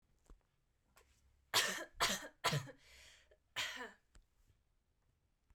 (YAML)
cough_length: 5.5 s
cough_amplitude: 3538
cough_signal_mean_std_ratio: 0.34
survey_phase: beta (2021-08-13 to 2022-03-07)
age: 18-44
gender: Female
wearing_mask: 'No'
symptom_none: true
smoker_status: Never smoked
respiratory_condition_asthma: false
respiratory_condition_other: false
recruitment_source: REACT
submission_delay: 1 day
covid_test_result: Negative
covid_test_method: RT-qPCR
influenza_a_test_result: Negative
influenza_b_test_result: Negative